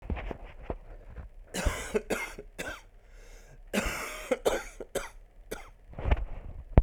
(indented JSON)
{
  "cough_length": "6.8 s",
  "cough_amplitude": 25101,
  "cough_signal_mean_std_ratio": 0.47,
  "survey_phase": "alpha (2021-03-01 to 2021-08-12)",
  "age": "18-44",
  "gender": "Male",
  "wearing_mask": "No",
  "symptom_cough_any": true,
  "symptom_fatigue": true,
  "symptom_fever_high_temperature": true,
  "symptom_headache": true,
  "symptom_change_to_sense_of_smell_or_taste": true,
  "symptom_loss_of_taste": true,
  "smoker_status": "Ex-smoker",
  "respiratory_condition_asthma": false,
  "respiratory_condition_other": false,
  "recruitment_source": "Test and Trace",
  "submission_delay": "2 days",
  "covid_test_result": "Positive",
  "covid_test_method": "RT-qPCR",
  "covid_ct_value": 28.9,
  "covid_ct_gene": "ORF1ab gene",
  "covid_ct_mean": 29.3,
  "covid_viral_load": "250 copies/ml",
  "covid_viral_load_category": "Minimal viral load (< 10K copies/ml)"
}